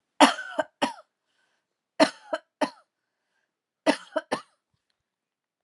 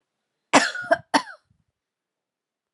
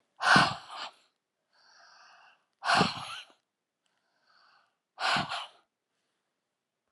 {"three_cough_length": "5.6 s", "three_cough_amplitude": 24378, "three_cough_signal_mean_std_ratio": 0.24, "cough_length": "2.7 s", "cough_amplitude": 29280, "cough_signal_mean_std_ratio": 0.26, "exhalation_length": "6.9 s", "exhalation_amplitude": 14123, "exhalation_signal_mean_std_ratio": 0.31, "survey_phase": "beta (2021-08-13 to 2022-03-07)", "age": "45-64", "gender": "Female", "wearing_mask": "No", "symptom_none": true, "smoker_status": "Never smoked", "respiratory_condition_asthma": false, "respiratory_condition_other": false, "recruitment_source": "REACT", "submission_delay": "3 days", "covid_test_result": "Negative", "covid_test_method": "RT-qPCR"}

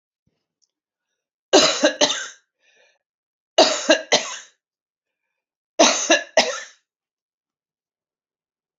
{"three_cough_length": "8.8 s", "three_cough_amplitude": 29201, "three_cough_signal_mean_std_ratio": 0.32, "survey_phase": "beta (2021-08-13 to 2022-03-07)", "age": "65+", "gender": "Female", "wearing_mask": "No", "symptom_none": true, "smoker_status": "Ex-smoker", "respiratory_condition_asthma": false, "respiratory_condition_other": false, "recruitment_source": "REACT", "submission_delay": "2 days", "covid_test_result": "Negative", "covid_test_method": "RT-qPCR", "influenza_a_test_result": "Negative", "influenza_b_test_result": "Negative"}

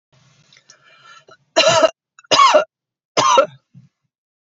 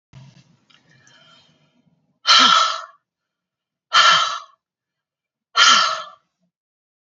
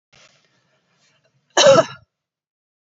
{"three_cough_length": "4.5 s", "three_cough_amplitude": 30270, "three_cough_signal_mean_std_ratio": 0.38, "exhalation_length": "7.2 s", "exhalation_amplitude": 31693, "exhalation_signal_mean_std_ratio": 0.35, "cough_length": "2.9 s", "cough_amplitude": 28809, "cough_signal_mean_std_ratio": 0.26, "survey_phase": "beta (2021-08-13 to 2022-03-07)", "age": "45-64", "gender": "Female", "wearing_mask": "No", "symptom_none": true, "smoker_status": "Never smoked", "respiratory_condition_asthma": false, "respiratory_condition_other": false, "recruitment_source": "REACT", "submission_delay": "2 days", "covid_test_result": "Negative", "covid_test_method": "RT-qPCR"}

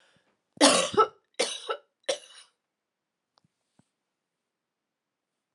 {"three_cough_length": "5.5 s", "three_cough_amplitude": 21730, "three_cough_signal_mean_std_ratio": 0.25, "survey_phase": "alpha (2021-03-01 to 2021-08-12)", "age": "45-64", "gender": "Female", "wearing_mask": "No", "symptom_change_to_sense_of_smell_or_taste": true, "symptom_loss_of_taste": true, "smoker_status": "Never smoked", "respiratory_condition_asthma": false, "respiratory_condition_other": false, "recruitment_source": "Test and Trace", "submission_delay": "2 days", "covid_test_result": "Positive", "covid_test_method": "RT-qPCR"}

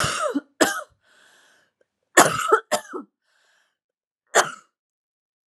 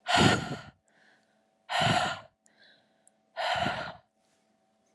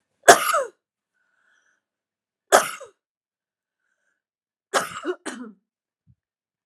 {"cough_length": "5.5 s", "cough_amplitude": 32768, "cough_signal_mean_std_ratio": 0.32, "exhalation_length": "4.9 s", "exhalation_amplitude": 13011, "exhalation_signal_mean_std_ratio": 0.42, "three_cough_length": "6.7 s", "three_cough_amplitude": 32768, "three_cough_signal_mean_std_ratio": 0.22, "survey_phase": "alpha (2021-03-01 to 2021-08-12)", "age": "18-44", "gender": "Female", "wearing_mask": "No", "symptom_cough_any": true, "symptom_abdominal_pain": true, "symptom_headache": true, "symptom_onset": "3 days", "smoker_status": "Ex-smoker", "respiratory_condition_asthma": false, "respiratory_condition_other": false, "recruitment_source": "Test and Trace", "submission_delay": "2 days", "covid_test_result": "Positive", "covid_test_method": "RT-qPCR", "covid_ct_value": 15.2, "covid_ct_gene": "ORF1ab gene", "covid_ct_mean": 15.3, "covid_viral_load": "9700000 copies/ml", "covid_viral_load_category": "High viral load (>1M copies/ml)"}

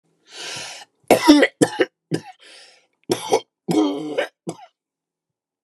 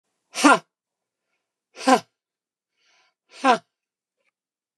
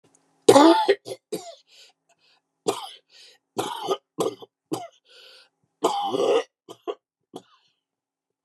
{"cough_length": "5.6 s", "cough_amplitude": 29204, "cough_signal_mean_std_ratio": 0.37, "exhalation_length": "4.8 s", "exhalation_amplitude": 26584, "exhalation_signal_mean_std_ratio": 0.23, "three_cough_length": "8.4 s", "three_cough_amplitude": 28479, "three_cough_signal_mean_std_ratio": 0.32, "survey_phase": "beta (2021-08-13 to 2022-03-07)", "age": "65+", "gender": "Female", "wearing_mask": "No", "symptom_none": true, "smoker_status": "Never smoked", "respiratory_condition_asthma": false, "respiratory_condition_other": false, "recruitment_source": "REACT", "submission_delay": "3 days", "covid_test_result": "Negative", "covid_test_method": "RT-qPCR"}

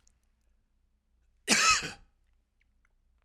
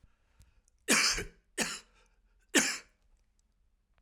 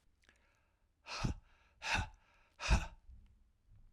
{"cough_length": "3.2 s", "cough_amplitude": 11422, "cough_signal_mean_std_ratio": 0.28, "three_cough_length": "4.0 s", "three_cough_amplitude": 9337, "three_cough_signal_mean_std_ratio": 0.33, "exhalation_length": "3.9 s", "exhalation_amplitude": 3529, "exhalation_signal_mean_std_ratio": 0.35, "survey_phase": "beta (2021-08-13 to 2022-03-07)", "age": "65+", "gender": "Male", "wearing_mask": "No", "symptom_none": true, "smoker_status": "Ex-smoker", "respiratory_condition_asthma": false, "respiratory_condition_other": false, "recruitment_source": "REACT", "submission_delay": "2 days", "covid_test_result": "Negative", "covid_test_method": "RT-qPCR", "influenza_a_test_result": "Negative", "influenza_b_test_result": "Negative"}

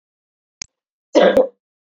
{"exhalation_length": "1.9 s", "exhalation_amplitude": 27525, "exhalation_signal_mean_std_ratio": 0.33, "survey_phase": "beta (2021-08-13 to 2022-03-07)", "age": "45-64", "gender": "Female", "wearing_mask": "No", "symptom_cough_any": true, "smoker_status": "Never smoked", "respiratory_condition_asthma": false, "respiratory_condition_other": false, "recruitment_source": "Test and Trace", "submission_delay": "2 days", "covid_test_result": "Positive", "covid_test_method": "RT-qPCR", "covid_ct_value": 20.0, "covid_ct_gene": "ORF1ab gene", "covid_ct_mean": 20.2, "covid_viral_load": "230000 copies/ml", "covid_viral_load_category": "Low viral load (10K-1M copies/ml)"}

